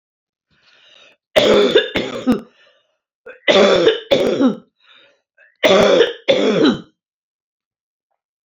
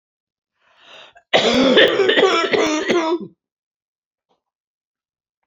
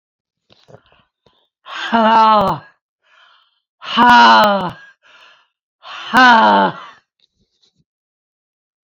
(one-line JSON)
{"three_cough_length": "8.4 s", "three_cough_amplitude": 32397, "three_cough_signal_mean_std_ratio": 0.48, "cough_length": "5.5 s", "cough_amplitude": 28504, "cough_signal_mean_std_ratio": 0.49, "exhalation_length": "8.9 s", "exhalation_amplitude": 30437, "exhalation_signal_mean_std_ratio": 0.42, "survey_phase": "beta (2021-08-13 to 2022-03-07)", "age": "65+", "gender": "Female", "wearing_mask": "No", "symptom_cough_any": true, "symptom_runny_or_blocked_nose": true, "smoker_status": "Never smoked", "respiratory_condition_asthma": false, "respiratory_condition_other": false, "recruitment_source": "REACT", "submission_delay": "2 days", "covid_test_result": "Negative", "covid_test_method": "RT-qPCR", "influenza_a_test_result": "Negative", "influenza_b_test_result": "Negative"}